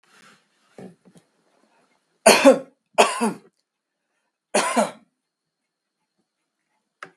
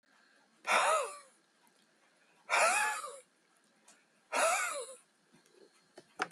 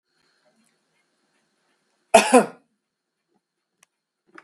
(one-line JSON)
{"three_cough_length": "7.2 s", "three_cough_amplitude": 32768, "three_cough_signal_mean_std_ratio": 0.25, "exhalation_length": "6.3 s", "exhalation_amplitude": 6406, "exhalation_signal_mean_std_ratio": 0.42, "cough_length": "4.4 s", "cough_amplitude": 32768, "cough_signal_mean_std_ratio": 0.18, "survey_phase": "beta (2021-08-13 to 2022-03-07)", "age": "45-64", "gender": "Male", "wearing_mask": "No", "symptom_none": true, "smoker_status": "Never smoked", "respiratory_condition_asthma": false, "respiratory_condition_other": false, "recruitment_source": "REACT", "submission_delay": "1 day", "covid_test_result": "Negative", "covid_test_method": "RT-qPCR"}